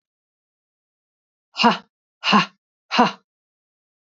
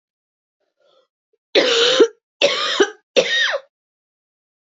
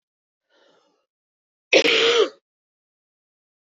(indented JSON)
{
  "exhalation_length": "4.2 s",
  "exhalation_amplitude": 27238,
  "exhalation_signal_mean_std_ratio": 0.27,
  "three_cough_length": "4.6 s",
  "three_cough_amplitude": 28122,
  "three_cough_signal_mean_std_ratio": 0.43,
  "cough_length": "3.7 s",
  "cough_amplitude": 25044,
  "cough_signal_mean_std_ratio": 0.31,
  "survey_phase": "beta (2021-08-13 to 2022-03-07)",
  "age": "18-44",
  "gender": "Female",
  "wearing_mask": "No",
  "symptom_cough_any": true,
  "symptom_shortness_of_breath": true,
  "symptom_fatigue": true,
  "symptom_fever_high_temperature": true,
  "symptom_change_to_sense_of_smell_or_taste": true,
  "symptom_loss_of_taste": true,
  "symptom_onset": "5 days",
  "smoker_status": "Never smoked",
  "respiratory_condition_asthma": false,
  "respiratory_condition_other": false,
  "recruitment_source": "REACT",
  "submission_delay": "-1 day",
  "covid_test_result": "Positive",
  "covid_test_method": "RT-qPCR",
  "covid_ct_value": 24.0,
  "covid_ct_gene": "E gene",
  "influenza_a_test_result": "Negative",
  "influenza_b_test_result": "Negative"
}